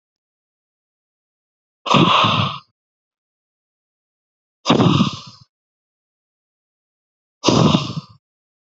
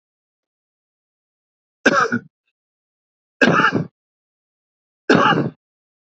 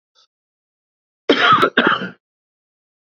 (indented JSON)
{
  "exhalation_length": "8.8 s",
  "exhalation_amplitude": 32768,
  "exhalation_signal_mean_std_ratio": 0.34,
  "three_cough_length": "6.1 s",
  "three_cough_amplitude": 28667,
  "three_cough_signal_mean_std_ratio": 0.33,
  "cough_length": "3.2 s",
  "cough_amplitude": 31366,
  "cough_signal_mean_std_ratio": 0.36,
  "survey_phase": "beta (2021-08-13 to 2022-03-07)",
  "age": "45-64",
  "gender": "Male",
  "wearing_mask": "No",
  "symptom_none": true,
  "smoker_status": "Ex-smoker",
  "respiratory_condition_asthma": false,
  "respiratory_condition_other": false,
  "recruitment_source": "REACT",
  "submission_delay": "6 days",
  "covid_test_result": "Negative",
  "covid_test_method": "RT-qPCR",
  "influenza_a_test_result": "Negative",
  "influenza_b_test_result": "Negative"
}